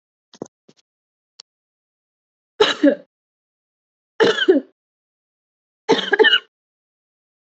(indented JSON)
{
  "three_cough_length": "7.5 s",
  "three_cough_amplitude": 27927,
  "three_cough_signal_mean_std_ratio": 0.28,
  "survey_phase": "alpha (2021-03-01 to 2021-08-12)",
  "age": "18-44",
  "gender": "Female",
  "wearing_mask": "No",
  "symptom_none": true,
  "symptom_onset": "7 days",
  "smoker_status": "Never smoked",
  "respiratory_condition_asthma": false,
  "respiratory_condition_other": false,
  "recruitment_source": "REACT",
  "submission_delay": "1 day",
  "covid_test_result": "Negative",
  "covid_test_method": "RT-qPCR"
}